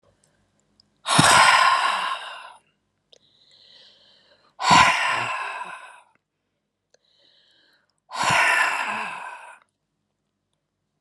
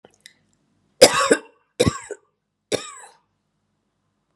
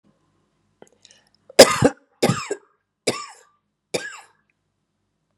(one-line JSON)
{"exhalation_length": "11.0 s", "exhalation_amplitude": 27828, "exhalation_signal_mean_std_ratio": 0.41, "three_cough_length": "4.4 s", "three_cough_amplitude": 32768, "three_cough_signal_mean_std_ratio": 0.24, "cough_length": "5.4 s", "cough_amplitude": 32768, "cough_signal_mean_std_ratio": 0.22, "survey_phase": "beta (2021-08-13 to 2022-03-07)", "age": "65+", "gender": "Female", "wearing_mask": "No", "symptom_cough_any": true, "smoker_status": "Never smoked", "respiratory_condition_asthma": false, "respiratory_condition_other": false, "recruitment_source": "REACT", "submission_delay": "1 day", "covid_test_result": "Negative", "covid_test_method": "RT-qPCR"}